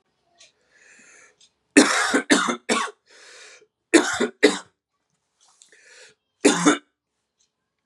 {"three_cough_length": "7.9 s", "three_cough_amplitude": 32691, "three_cough_signal_mean_std_ratio": 0.33, "survey_phase": "beta (2021-08-13 to 2022-03-07)", "age": "18-44", "gender": "Male", "wearing_mask": "No", "symptom_cough_any": true, "symptom_new_continuous_cough": true, "symptom_runny_or_blocked_nose": true, "symptom_sore_throat": true, "symptom_headache": true, "symptom_onset": "4 days", "smoker_status": "Never smoked", "respiratory_condition_asthma": false, "respiratory_condition_other": false, "recruitment_source": "Test and Trace", "submission_delay": "1 day", "covid_test_method": "RT-qPCR", "covid_ct_value": 30.2, "covid_ct_gene": "ORF1ab gene", "covid_ct_mean": 30.7, "covid_viral_load": "85 copies/ml", "covid_viral_load_category": "Minimal viral load (< 10K copies/ml)"}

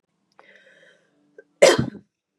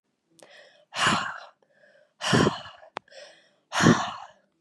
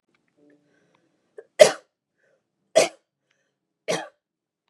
{"cough_length": "2.4 s", "cough_amplitude": 32469, "cough_signal_mean_std_ratio": 0.24, "exhalation_length": "4.6 s", "exhalation_amplitude": 22824, "exhalation_signal_mean_std_ratio": 0.38, "three_cough_length": "4.7 s", "three_cough_amplitude": 32768, "three_cough_signal_mean_std_ratio": 0.17, "survey_phase": "beta (2021-08-13 to 2022-03-07)", "age": "18-44", "gender": "Female", "wearing_mask": "No", "symptom_runny_or_blocked_nose": true, "smoker_status": "Never smoked", "respiratory_condition_asthma": false, "respiratory_condition_other": false, "recruitment_source": "REACT", "submission_delay": "0 days", "covid_test_result": "Negative", "covid_test_method": "RT-qPCR", "influenza_a_test_result": "Negative", "influenza_b_test_result": "Negative"}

